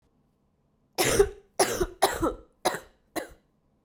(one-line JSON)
{"three_cough_length": "3.8 s", "three_cough_amplitude": 15533, "three_cough_signal_mean_std_ratio": 0.4, "survey_phase": "beta (2021-08-13 to 2022-03-07)", "age": "18-44", "gender": "Female", "wearing_mask": "No", "symptom_cough_any": true, "symptom_runny_or_blocked_nose": true, "symptom_sore_throat": true, "symptom_fatigue": true, "symptom_headache": true, "symptom_other": true, "symptom_onset": "4 days", "smoker_status": "Never smoked", "respiratory_condition_asthma": false, "respiratory_condition_other": false, "recruitment_source": "Test and Trace", "submission_delay": "1 day", "covid_test_result": "Positive", "covid_test_method": "RT-qPCR", "covid_ct_value": 21.4, "covid_ct_gene": "ORF1ab gene", "covid_ct_mean": 22.2, "covid_viral_load": "53000 copies/ml", "covid_viral_load_category": "Low viral load (10K-1M copies/ml)"}